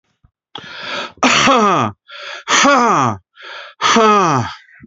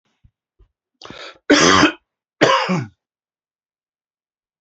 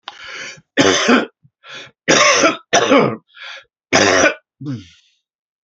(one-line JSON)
{"exhalation_length": "4.9 s", "exhalation_amplitude": 29655, "exhalation_signal_mean_std_ratio": 0.63, "cough_length": "4.6 s", "cough_amplitude": 31415, "cough_signal_mean_std_ratio": 0.35, "three_cough_length": "5.6 s", "three_cough_amplitude": 32767, "three_cough_signal_mean_std_ratio": 0.51, "survey_phase": "beta (2021-08-13 to 2022-03-07)", "age": "65+", "gender": "Male", "wearing_mask": "No", "symptom_runny_or_blocked_nose": true, "symptom_headache": true, "symptom_onset": "12 days", "smoker_status": "Ex-smoker", "respiratory_condition_asthma": false, "respiratory_condition_other": false, "recruitment_source": "REACT", "submission_delay": "3 days", "covid_test_result": "Negative", "covid_test_method": "RT-qPCR"}